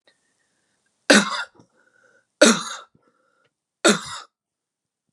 {
  "three_cough_length": "5.1 s",
  "three_cough_amplitude": 31690,
  "three_cough_signal_mean_std_ratio": 0.26,
  "survey_phase": "beta (2021-08-13 to 2022-03-07)",
  "age": "18-44",
  "gender": "Female",
  "wearing_mask": "No",
  "symptom_cough_any": true,
  "symptom_new_continuous_cough": true,
  "symptom_runny_or_blocked_nose": true,
  "symptom_sore_throat": true,
  "symptom_fatigue": true,
  "symptom_headache": true,
  "symptom_onset": "2 days",
  "smoker_status": "Never smoked",
  "respiratory_condition_asthma": false,
  "respiratory_condition_other": false,
  "recruitment_source": "Test and Trace",
  "submission_delay": "1 day",
  "covid_test_result": "Positive",
  "covid_test_method": "RT-qPCR",
  "covid_ct_value": 23.6,
  "covid_ct_gene": "ORF1ab gene",
  "covid_ct_mean": 23.9,
  "covid_viral_load": "14000 copies/ml",
  "covid_viral_load_category": "Low viral load (10K-1M copies/ml)"
}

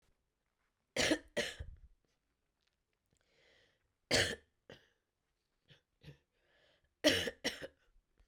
{
  "three_cough_length": "8.3 s",
  "three_cough_amplitude": 5868,
  "three_cough_signal_mean_std_ratio": 0.27,
  "survey_phase": "beta (2021-08-13 to 2022-03-07)",
  "age": "45-64",
  "gender": "Female",
  "wearing_mask": "No",
  "symptom_cough_any": true,
  "symptom_new_continuous_cough": true,
  "symptom_runny_or_blocked_nose": true,
  "symptom_fatigue": true,
  "symptom_fever_high_temperature": true,
  "symptom_headache": true,
  "symptom_onset": "3 days",
  "smoker_status": "Never smoked",
  "respiratory_condition_asthma": false,
  "respiratory_condition_other": false,
  "recruitment_source": "Test and Trace",
  "submission_delay": "2 days",
  "covid_test_result": "Positive",
  "covid_test_method": "ePCR"
}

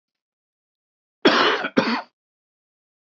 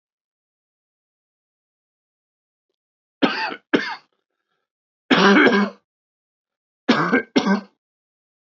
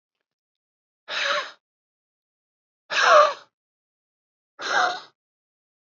{
  "cough_length": "3.1 s",
  "cough_amplitude": 25949,
  "cough_signal_mean_std_ratio": 0.35,
  "three_cough_length": "8.4 s",
  "three_cough_amplitude": 26687,
  "three_cough_signal_mean_std_ratio": 0.33,
  "exhalation_length": "5.8 s",
  "exhalation_amplitude": 22528,
  "exhalation_signal_mean_std_ratio": 0.31,
  "survey_phase": "beta (2021-08-13 to 2022-03-07)",
  "age": "45-64",
  "gender": "Male",
  "wearing_mask": "No",
  "symptom_cough_any": true,
  "symptom_runny_or_blocked_nose": true,
  "symptom_shortness_of_breath": true,
  "symptom_sore_throat": true,
  "symptom_diarrhoea": true,
  "symptom_fatigue": true,
  "symptom_headache": true,
  "symptom_onset": "4 days",
  "smoker_status": "Never smoked",
  "respiratory_condition_asthma": false,
  "respiratory_condition_other": false,
  "recruitment_source": "Test and Trace",
  "submission_delay": "2 days",
  "covid_test_result": "Positive",
  "covid_test_method": "RT-qPCR",
  "covid_ct_value": 22.3,
  "covid_ct_gene": "ORF1ab gene",
  "covid_ct_mean": 22.5,
  "covid_viral_load": "40000 copies/ml",
  "covid_viral_load_category": "Low viral load (10K-1M copies/ml)"
}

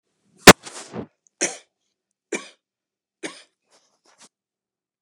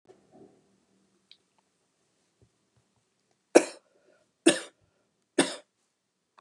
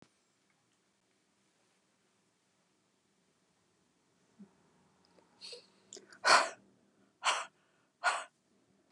{
  "cough_length": "5.0 s",
  "cough_amplitude": 32768,
  "cough_signal_mean_std_ratio": 0.13,
  "three_cough_length": "6.4 s",
  "three_cough_amplitude": 25482,
  "three_cough_signal_mean_std_ratio": 0.15,
  "exhalation_length": "8.9 s",
  "exhalation_amplitude": 9296,
  "exhalation_signal_mean_std_ratio": 0.2,
  "survey_phase": "beta (2021-08-13 to 2022-03-07)",
  "age": "65+",
  "gender": "Female",
  "wearing_mask": "No",
  "symptom_other": true,
  "symptom_onset": "12 days",
  "smoker_status": "Ex-smoker",
  "respiratory_condition_asthma": false,
  "respiratory_condition_other": false,
  "recruitment_source": "REACT",
  "submission_delay": "2 days",
  "covid_test_result": "Negative",
  "covid_test_method": "RT-qPCR",
  "influenza_a_test_result": "Negative",
  "influenza_b_test_result": "Negative"
}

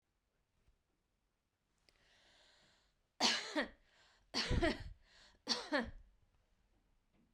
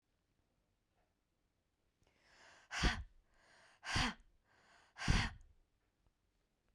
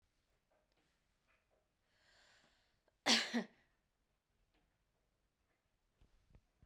{
  "three_cough_length": "7.3 s",
  "three_cough_amplitude": 4583,
  "three_cough_signal_mean_std_ratio": 0.33,
  "exhalation_length": "6.7 s",
  "exhalation_amplitude": 3299,
  "exhalation_signal_mean_std_ratio": 0.28,
  "cough_length": "6.7 s",
  "cough_amplitude": 4040,
  "cough_signal_mean_std_ratio": 0.18,
  "survey_phase": "beta (2021-08-13 to 2022-03-07)",
  "age": "18-44",
  "gender": "Female",
  "wearing_mask": "No",
  "symptom_none": true,
  "smoker_status": "Never smoked",
  "respiratory_condition_asthma": false,
  "respiratory_condition_other": false,
  "recruitment_source": "REACT",
  "submission_delay": "1 day",
  "covid_test_result": "Negative",
  "covid_test_method": "RT-qPCR",
  "influenza_a_test_result": "Negative",
  "influenza_b_test_result": "Negative"
}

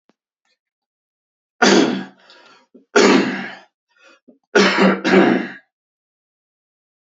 {
  "three_cough_length": "7.2 s",
  "three_cough_amplitude": 29578,
  "three_cough_signal_mean_std_ratio": 0.4,
  "survey_phase": "beta (2021-08-13 to 2022-03-07)",
  "age": "18-44",
  "gender": "Male",
  "wearing_mask": "No",
  "symptom_none": true,
  "symptom_onset": "13 days",
  "smoker_status": "Never smoked",
  "respiratory_condition_asthma": false,
  "respiratory_condition_other": false,
  "recruitment_source": "REACT",
  "submission_delay": "3 days",
  "covid_test_result": "Negative",
  "covid_test_method": "RT-qPCR",
  "influenza_a_test_result": "Negative",
  "influenza_b_test_result": "Negative"
}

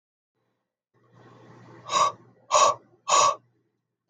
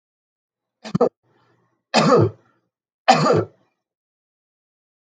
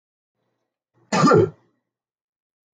{
  "exhalation_length": "4.1 s",
  "exhalation_amplitude": 14535,
  "exhalation_signal_mean_std_ratio": 0.35,
  "three_cough_length": "5.0 s",
  "three_cough_amplitude": 32766,
  "three_cough_signal_mean_std_ratio": 0.33,
  "cough_length": "2.7 s",
  "cough_amplitude": 22269,
  "cough_signal_mean_std_ratio": 0.3,
  "survey_phase": "beta (2021-08-13 to 2022-03-07)",
  "age": "45-64",
  "gender": "Male",
  "wearing_mask": "No",
  "symptom_sore_throat": true,
  "symptom_onset": "2 days",
  "smoker_status": "Never smoked",
  "respiratory_condition_asthma": false,
  "respiratory_condition_other": false,
  "recruitment_source": "Test and Trace",
  "submission_delay": "1 day",
  "covid_test_result": "Negative",
  "covid_test_method": "RT-qPCR"
}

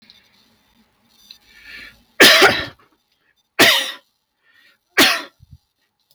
{
  "three_cough_length": "6.1 s",
  "three_cough_amplitude": 32768,
  "three_cough_signal_mean_std_ratio": 0.32,
  "survey_phase": "beta (2021-08-13 to 2022-03-07)",
  "age": "65+",
  "gender": "Male",
  "wearing_mask": "No",
  "symptom_cough_any": true,
  "symptom_runny_or_blocked_nose": true,
  "smoker_status": "Never smoked",
  "respiratory_condition_asthma": false,
  "respiratory_condition_other": false,
  "recruitment_source": "REACT",
  "submission_delay": "5 days",
  "covid_test_result": "Negative",
  "covid_test_method": "RT-qPCR",
  "influenza_a_test_result": "Negative",
  "influenza_b_test_result": "Negative"
}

